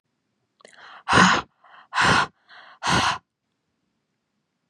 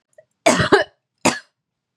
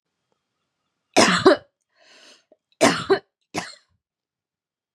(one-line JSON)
{"exhalation_length": "4.7 s", "exhalation_amplitude": 29245, "exhalation_signal_mean_std_ratio": 0.37, "cough_length": "2.0 s", "cough_amplitude": 32717, "cough_signal_mean_std_ratio": 0.36, "three_cough_length": "4.9 s", "three_cough_amplitude": 31035, "three_cough_signal_mean_std_ratio": 0.29, "survey_phase": "beta (2021-08-13 to 2022-03-07)", "age": "18-44", "gender": "Female", "wearing_mask": "No", "symptom_cough_any": true, "symptom_sore_throat": true, "symptom_fatigue": true, "symptom_headache": true, "symptom_onset": "3 days", "smoker_status": "Never smoked", "respiratory_condition_asthma": false, "respiratory_condition_other": false, "recruitment_source": "Test and Trace", "submission_delay": "2 days", "covid_test_result": "Positive", "covid_test_method": "RT-qPCR", "covid_ct_value": 22.7, "covid_ct_gene": "ORF1ab gene"}